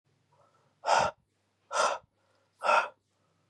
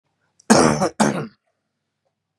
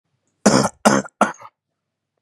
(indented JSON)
{
  "exhalation_length": "3.5 s",
  "exhalation_amplitude": 8517,
  "exhalation_signal_mean_std_ratio": 0.36,
  "cough_length": "2.4 s",
  "cough_amplitude": 31540,
  "cough_signal_mean_std_ratio": 0.37,
  "three_cough_length": "2.2 s",
  "three_cough_amplitude": 32767,
  "three_cough_signal_mean_std_ratio": 0.35,
  "survey_phase": "beta (2021-08-13 to 2022-03-07)",
  "age": "18-44",
  "gender": "Male",
  "wearing_mask": "No",
  "symptom_none": true,
  "smoker_status": "Current smoker (e-cigarettes or vapes only)",
  "respiratory_condition_asthma": false,
  "respiratory_condition_other": false,
  "recruitment_source": "REACT",
  "submission_delay": "2 days",
  "covid_test_result": "Negative",
  "covid_test_method": "RT-qPCR",
  "influenza_a_test_result": "Negative",
  "influenza_b_test_result": "Negative"
}